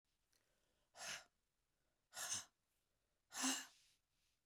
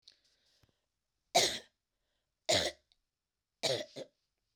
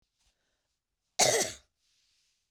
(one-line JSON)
{"exhalation_length": "4.5 s", "exhalation_amplitude": 1087, "exhalation_signal_mean_std_ratio": 0.33, "three_cough_length": "4.6 s", "three_cough_amplitude": 8047, "three_cough_signal_mean_std_ratio": 0.29, "cough_length": "2.5 s", "cough_amplitude": 10315, "cough_signal_mean_std_ratio": 0.27, "survey_phase": "beta (2021-08-13 to 2022-03-07)", "age": "45-64", "gender": "Female", "wearing_mask": "No", "symptom_runny_or_blocked_nose": true, "symptom_sore_throat": true, "symptom_fatigue": true, "symptom_headache": true, "smoker_status": "Never smoked", "respiratory_condition_asthma": false, "respiratory_condition_other": false, "recruitment_source": "Test and Trace", "submission_delay": "0 days", "covid_test_result": "Positive", "covid_test_method": "LFT"}